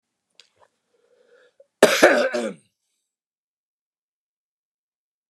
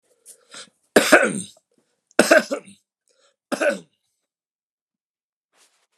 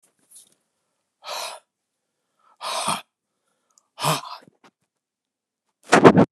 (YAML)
cough_length: 5.3 s
cough_amplitude: 32767
cough_signal_mean_std_ratio: 0.23
three_cough_length: 6.0 s
three_cough_amplitude: 32768
three_cough_signal_mean_std_ratio: 0.27
exhalation_length: 6.3 s
exhalation_amplitude: 32768
exhalation_signal_mean_std_ratio: 0.24
survey_phase: beta (2021-08-13 to 2022-03-07)
age: 65+
gender: Male
wearing_mask: 'No'
symptom_cough_any: true
symptom_shortness_of_breath: true
smoker_status: Never smoked
respiratory_condition_asthma: false
respiratory_condition_other: false
recruitment_source: REACT
submission_delay: 1 day
covid_test_result: Negative
covid_test_method: RT-qPCR
influenza_a_test_result: Negative
influenza_b_test_result: Negative